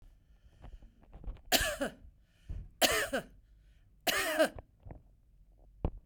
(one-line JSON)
{"three_cough_length": "6.1 s", "three_cough_amplitude": 9867, "three_cough_signal_mean_std_ratio": 0.42, "survey_phase": "beta (2021-08-13 to 2022-03-07)", "age": "45-64", "gender": "Female", "wearing_mask": "No", "symptom_headache": true, "smoker_status": "Ex-smoker", "respiratory_condition_asthma": false, "respiratory_condition_other": false, "recruitment_source": "REACT", "submission_delay": "1 day", "covid_test_result": "Negative", "covid_test_method": "RT-qPCR", "influenza_a_test_result": "Unknown/Void", "influenza_b_test_result": "Unknown/Void"}